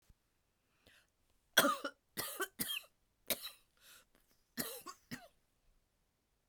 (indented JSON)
{
  "three_cough_length": "6.5 s",
  "three_cough_amplitude": 8532,
  "three_cough_signal_mean_std_ratio": 0.28,
  "survey_phase": "beta (2021-08-13 to 2022-03-07)",
  "age": "45-64",
  "gender": "Female",
  "wearing_mask": "No",
  "symptom_cough_any": true,
  "symptom_sore_throat": true,
  "symptom_onset": "6 days",
  "smoker_status": "Never smoked",
  "respiratory_condition_asthma": false,
  "respiratory_condition_other": false,
  "recruitment_source": "Test and Trace",
  "submission_delay": "1 day",
  "covid_test_result": "Negative",
  "covid_test_method": "RT-qPCR"
}